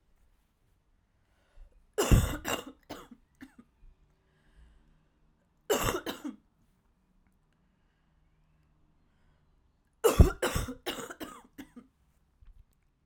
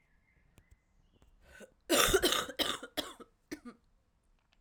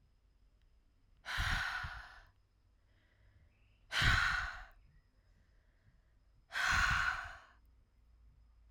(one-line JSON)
{"three_cough_length": "13.1 s", "three_cough_amplitude": 16867, "three_cough_signal_mean_std_ratio": 0.24, "cough_length": "4.6 s", "cough_amplitude": 10353, "cough_signal_mean_std_ratio": 0.34, "exhalation_length": "8.7 s", "exhalation_amplitude": 5542, "exhalation_signal_mean_std_ratio": 0.42, "survey_phase": "alpha (2021-03-01 to 2021-08-12)", "age": "18-44", "gender": "Female", "wearing_mask": "No", "symptom_cough_any": true, "symptom_shortness_of_breath": true, "symptom_diarrhoea": true, "symptom_fatigue": true, "symptom_headache": true, "symptom_change_to_sense_of_smell_or_taste": true, "symptom_loss_of_taste": true, "symptom_onset": "3 days", "smoker_status": "Never smoked", "respiratory_condition_asthma": false, "respiratory_condition_other": false, "recruitment_source": "Test and Trace", "submission_delay": "2 days", "covid_test_result": "Positive", "covid_test_method": "RT-qPCR"}